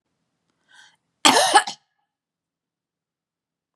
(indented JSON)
{
  "cough_length": "3.8 s",
  "cough_amplitude": 31745,
  "cough_signal_mean_std_ratio": 0.24,
  "survey_phase": "beta (2021-08-13 to 2022-03-07)",
  "age": "45-64",
  "gender": "Female",
  "wearing_mask": "No",
  "symptom_none": true,
  "smoker_status": "Ex-smoker",
  "respiratory_condition_asthma": false,
  "respiratory_condition_other": false,
  "recruitment_source": "REACT",
  "submission_delay": "1 day",
  "covid_test_result": "Negative",
  "covid_test_method": "RT-qPCR",
  "influenza_a_test_result": "Negative",
  "influenza_b_test_result": "Negative"
}